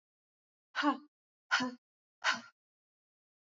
{
  "exhalation_length": "3.6 s",
  "exhalation_amplitude": 5111,
  "exhalation_signal_mean_std_ratio": 0.3,
  "survey_phase": "beta (2021-08-13 to 2022-03-07)",
  "age": "18-44",
  "gender": "Female",
  "wearing_mask": "No",
  "symptom_fatigue": true,
  "symptom_headache": true,
  "smoker_status": "Never smoked",
  "respiratory_condition_asthma": false,
  "respiratory_condition_other": false,
  "recruitment_source": "REACT",
  "submission_delay": "2 days",
  "covid_test_result": "Negative",
  "covid_test_method": "RT-qPCR",
  "influenza_a_test_result": "Negative",
  "influenza_b_test_result": "Negative"
}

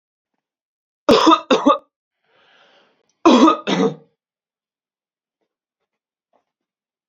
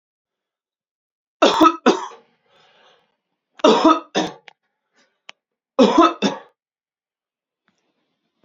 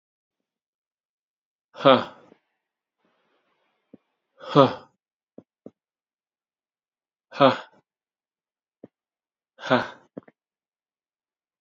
{
  "cough_length": "7.1 s",
  "cough_amplitude": 32767,
  "cough_signal_mean_std_ratio": 0.31,
  "three_cough_length": "8.4 s",
  "three_cough_amplitude": 29464,
  "three_cough_signal_mean_std_ratio": 0.31,
  "exhalation_length": "11.6 s",
  "exhalation_amplitude": 28452,
  "exhalation_signal_mean_std_ratio": 0.18,
  "survey_phase": "beta (2021-08-13 to 2022-03-07)",
  "age": "18-44",
  "gender": "Male",
  "wearing_mask": "No",
  "symptom_runny_or_blocked_nose": true,
  "symptom_shortness_of_breath": true,
  "smoker_status": "Never smoked",
  "respiratory_condition_asthma": false,
  "respiratory_condition_other": false,
  "recruitment_source": "Test and Trace",
  "submission_delay": "2 days",
  "covid_test_result": "Positive",
  "covid_test_method": "RT-qPCR",
  "covid_ct_value": 32.8,
  "covid_ct_gene": "ORF1ab gene"
}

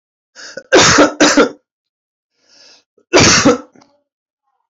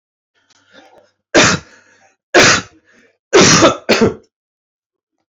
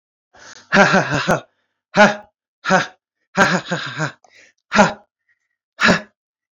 {
  "cough_length": "4.7 s",
  "cough_amplitude": 32767,
  "cough_signal_mean_std_ratio": 0.43,
  "three_cough_length": "5.4 s",
  "three_cough_amplitude": 32768,
  "three_cough_signal_mean_std_ratio": 0.4,
  "exhalation_length": "6.6 s",
  "exhalation_amplitude": 32064,
  "exhalation_signal_mean_std_ratio": 0.4,
  "survey_phase": "beta (2021-08-13 to 2022-03-07)",
  "age": "18-44",
  "gender": "Male",
  "wearing_mask": "No",
  "symptom_runny_or_blocked_nose": true,
  "symptom_shortness_of_breath": true,
  "symptom_sore_throat": true,
  "symptom_abdominal_pain": true,
  "symptom_fatigue": true,
  "symptom_headache": true,
  "symptom_onset": "12 days",
  "smoker_status": "Current smoker (11 or more cigarettes per day)",
  "respiratory_condition_asthma": false,
  "respiratory_condition_other": false,
  "recruitment_source": "REACT",
  "submission_delay": "7 days",
  "covid_test_result": "Negative",
  "covid_test_method": "RT-qPCR",
  "influenza_a_test_result": "Unknown/Void",
  "influenza_b_test_result": "Unknown/Void"
}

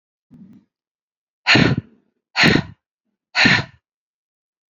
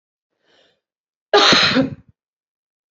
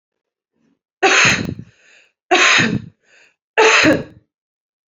{
  "exhalation_length": "4.7 s",
  "exhalation_amplitude": 32767,
  "exhalation_signal_mean_std_ratio": 0.34,
  "cough_length": "2.9 s",
  "cough_amplitude": 32768,
  "cough_signal_mean_std_ratio": 0.36,
  "three_cough_length": "4.9 s",
  "three_cough_amplitude": 31085,
  "three_cough_signal_mean_std_ratio": 0.44,
  "survey_phase": "beta (2021-08-13 to 2022-03-07)",
  "age": "18-44",
  "gender": "Female",
  "wearing_mask": "No",
  "symptom_cough_any": true,
  "symptom_sore_throat": true,
  "symptom_diarrhoea": true,
  "symptom_fatigue": true,
  "symptom_headache": true,
  "symptom_onset": "2 days",
  "smoker_status": "Current smoker (e-cigarettes or vapes only)",
  "respiratory_condition_asthma": false,
  "respiratory_condition_other": false,
  "recruitment_source": "Test and Trace",
  "submission_delay": "2 days",
  "covid_test_result": "Positive",
  "covid_test_method": "ePCR"
}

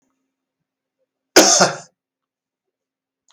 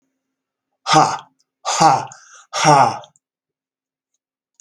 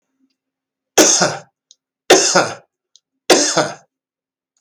{
  "cough_length": "3.3 s",
  "cough_amplitude": 32768,
  "cough_signal_mean_std_ratio": 0.25,
  "exhalation_length": "4.6 s",
  "exhalation_amplitude": 32766,
  "exhalation_signal_mean_std_ratio": 0.37,
  "three_cough_length": "4.6 s",
  "three_cough_amplitude": 32768,
  "three_cough_signal_mean_std_ratio": 0.39,
  "survey_phase": "beta (2021-08-13 to 2022-03-07)",
  "age": "65+",
  "gender": "Male",
  "wearing_mask": "No",
  "symptom_none": true,
  "smoker_status": "Never smoked",
  "respiratory_condition_asthma": true,
  "respiratory_condition_other": false,
  "recruitment_source": "REACT",
  "submission_delay": "1 day",
  "covid_test_result": "Negative",
  "covid_test_method": "RT-qPCR",
  "influenza_a_test_result": "Negative",
  "influenza_b_test_result": "Negative"
}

